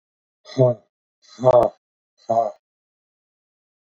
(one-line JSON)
{"exhalation_length": "3.8 s", "exhalation_amplitude": 25023, "exhalation_signal_mean_std_ratio": 0.31, "survey_phase": "beta (2021-08-13 to 2022-03-07)", "age": "45-64", "gender": "Male", "wearing_mask": "No", "symptom_cough_any": true, "symptom_fatigue": true, "smoker_status": "Ex-smoker", "respiratory_condition_asthma": false, "respiratory_condition_other": false, "recruitment_source": "Test and Trace", "submission_delay": "2 days", "covid_test_result": "Positive", "covid_test_method": "RT-qPCR", "covid_ct_value": 28.6, "covid_ct_gene": "ORF1ab gene"}